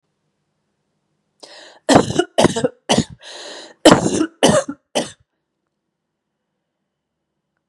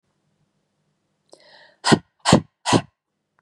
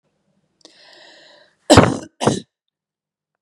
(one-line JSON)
{"cough_length": "7.7 s", "cough_amplitude": 32768, "cough_signal_mean_std_ratio": 0.32, "exhalation_length": "3.4 s", "exhalation_amplitude": 32615, "exhalation_signal_mean_std_ratio": 0.25, "three_cough_length": "3.4 s", "three_cough_amplitude": 32768, "three_cough_signal_mean_std_ratio": 0.25, "survey_phase": "beta (2021-08-13 to 2022-03-07)", "age": "18-44", "gender": "Female", "wearing_mask": "No", "symptom_none": true, "smoker_status": "Never smoked", "respiratory_condition_asthma": false, "respiratory_condition_other": false, "recruitment_source": "Test and Trace", "submission_delay": "2 days", "covid_test_result": "Positive", "covid_test_method": "LFT"}